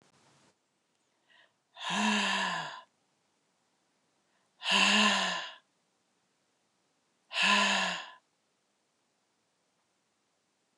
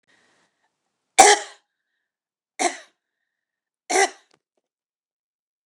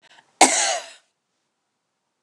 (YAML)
exhalation_length: 10.8 s
exhalation_amplitude: 8461
exhalation_signal_mean_std_ratio: 0.38
three_cough_length: 5.7 s
three_cough_amplitude: 29204
three_cough_signal_mean_std_ratio: 0.21
cough_length: 2.2 s
cough_amplitude: 29204
cough_signal_mean_std_ratio: 0.29
survey_phase: beta (2021-08-13 to 2022-03-07)
age: 45-64
gender: Female
wearing_mask: 'No'
symptom_sore_throat: true
symptom_fatigue: true
symptom_headache: true
smoker_status: Never smoked
respiratory_condition_asthma: false
respiratory_condition_other: false
recruitment_source: REACT
submission_delay: 1 day
covid_test_result: Negative
covid_test_method: RT-qPCR
influenza_a_test_result: Negative
influenza_b_test_result: Negative